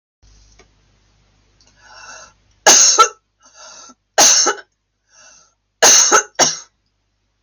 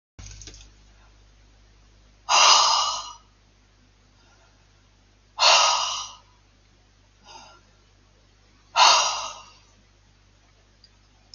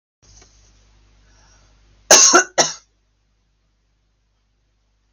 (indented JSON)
{
  "three_cough_length": "7.4 s",
  "three_cough_amplitude": 32768,
  "three_cough_signal_mean_std_ratio": 0.36,
  "exhalation_length": "11.3 s",
  "exhalation_amplitude": 25152,
  "exhalation_signal_mean_std_ratio": 0.33,
  "cough_length": "5.1 s",
  "cough_amplitude": 32768,
  "cough_signal_mean_std_ratio": 0.24,
  "survey_phase": "beta (2021-08-13 to 2022-03-07)",
  "age": "45-64",
  "gender": "Female",
  "wearing_mask": "No",
  "symptom_none": true,
  "smoker_status": "Ex-smoker",
  "respiratory_condition_asthma": false,
  "respiratory_condition_other": false,
  "recruitment_source": "REACT",
  "submission_delay": "3 days",
  "covid_test_result": "Negative",
  "covid_test_method": "RT-qPCR",
  "influenza_a_test_result": "Negative",
  "influenza_b_test_result": "Negative"
}